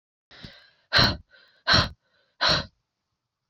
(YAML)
exhalation_length: 3.5 s
exhalation_amplitude: 16618
exhalation_signal_mean_std_ratio: 0.35
survey_phase: beta (2021-08-13 to 2022-03-07)
age: 18-44
gender: Female
wearing_mask: 'No'
symptom_runny_or_blocked_nose: true
symptom_change_to_sense_of_smell_or_taste: true
smoker_status: Never smoked
recruitment_source: Test and Trace
submission_delay: 2 days
covid_test_result: Positive
covid_test_method: RT-qPCR
covid_ct_value: 15.4
covid_ct_gene: ORF1ab gene
covid_ct_mean: 15.6
covid_viral_load: 7400000 copies/ml
covid_viral_load_category: High viral load (>1M copies/ml)